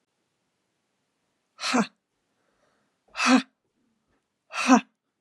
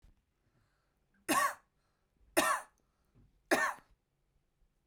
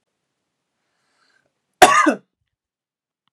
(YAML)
exhalation_length: 5.2 s
exhalation_amplitude: 23673
exhalation_signal_mean_std_ratio: 0.26
three_cough_length: 4.9 s
three_cough_amplitude: 6929
three_cough_signal_mean_std_ratio: 0.31
cough_length: 3.3 s
cough_amplitude: 32768
cough_signal_mean_std_ratio: 0.23
survey_phase: beta (2021-08-13 to 2022-03-07)
age: 18-44
gender: Female
wearing_mask: 'No'
symptom_runny_or_blocked_nose: true
symptom_sore_throat: true
smoker_status: Never smoked
respiratory_condition_asthma: false
respiratory_condition_other: false
recruitment_source: Test and Trace
submission_delay: 1 day
covid_test_result: Positive
covid_test_method: ePCR